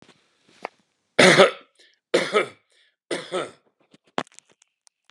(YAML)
three_cough_length: 5.1 s
three_cough_amplitude: 32599
three_cough_signal_mean_std_ratio: 0.28
survey_phase: beta (2021-08-13 to 2022-03-07)
age: 65+
gender: Male
wearing_mask: 'No'
symptom_cough_any: true
smoker_status: Never smoked
respiratory_condition_asthma: false
respiratory_condition_other: false
recruitment_source: REACT
submission_delay: 2 days
covid_test_result: Negative
covid_test_method: RT-qPCR
influenza_a_test_result: Negative
influenza_b_test_result: Negative